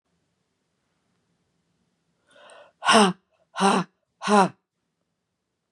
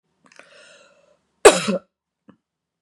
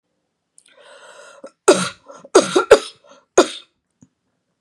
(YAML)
exhalation_length: 5.7 s
exhalation_amplitude: 23475
exhalation_signal_mean_std_ratio: 0.28
cough_length: 2.8 s
cough_amplitude: 32768
cough_signal_mean_std_ratio: 0.2
three_cough_length: 4.6 s
three_cough_amplitude: 32768
three_cough_signal_mean_std_ratio: 0.27
survey_phase: beta (2021-08-13 to 2022-03-07)
age: 45-64
gender: Female
wearing_mask: 'No'
symptom_cough_any: true
symptom_runny_or_blocked_nose: true
symptom_fatigue: true
symptom_headache: true
symptom_onset: 4 days
smoker_status: Never smoked
respiratory_condition_asthma: false
respiratory_condition_other: false
recruitment_source: Test and Trace
submission_delay: 2 days
covid_test_result: Positive
covid_test_method: RT-qPCR
covid_ct_value: 25.6
covid_ct_gene: ORF1ab gene
covid_ct_mean: 26.1
covid_viral_load: 2800 copies/ml
covid_viral_load_category: Minimal viral load (< 10K copies/ml)